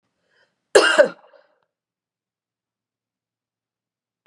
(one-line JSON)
{"cough_length": "4.3 s", "cough_amplitude": 32767, "cough_signal_mean_std_ratio": 0.2, "survey_phase": "beta (2021-08-13 to 2022-03-07)", "age": "18-44", "gender": "Female", "wearing_mask": "No", "symptom_runny_or_blocked_nose": true, "symptom_sore_throat": true, "symptom_fatigue": true, "symptom_change_to_sense_of_smell_or_taste": true, "smoker_status": "Never smoked", "respiratory_condition_asthma": false, "respiratory_condition_other": false, "recruitment_source": "Test and Trace", "submission_delay": "2 days", "covid_test_result": "Positive", "covid_test_method": "ePCR"}